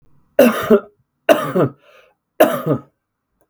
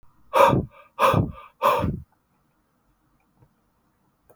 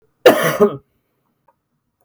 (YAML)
three_cough_length: 3.5 s
three_cough_amplitude: 32768
three_cough_signal_mean_std_ratio: 0.41
exhalation_length: 4.4 s
exhalation_amplitude: 25357
exhalation_signal_mean_std_ratio: 0.37
cough_length: 2.0 s
cough_amplitude: 32768
cough_signal_mean_std_ratio: 0.33
survey_phase: beta (2021-08-13 to 2022-03-07)
age: 18-44
gender: Male
wearing_mask: 'No'
symptom_none: true
smoker_status: Never smoked
respiratory_condition_asthma: true
respiratory_condition_other: false
recruitment_source: REACT
submission_delay: 0 days
covid_test_result: Negative
covid_test_method: RT-qPCR
influenza_a_test_result: Negative
influenza_b_test_result: Negative